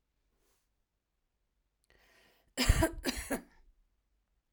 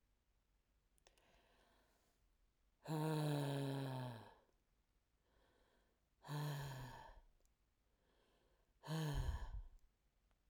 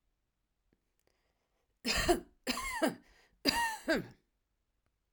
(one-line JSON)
{"cough_length": "4.5 s", "cough_amplitude": 9502, "cough_signal_mean_std_ratio": 0.26, "exhalation_length": "10.5 s", "exhalation_amplitude": 890, "exhalation_signal_mean_std_ratio": 0.46, "three_cough_length": "5.1 s", "three_cough_amplitude": 8288, "three_cough_signal_mean_std_ratio": 0.38, "survey_phase": "alpha (2021-03-01 to 2021-08-12)", "age": "45-64", "gender": "Female", "wearing_mask": "No", "symptom_none": true, "smoker_status": "Ex-smoker", "respiratory_condition_asthma": false, "respiratory_condition_other": false, "recruitment_source": "REACT", "submission_delay": "1 day", "covid_test_result": "Negative", "covid_test_method": "RT-qPCR"}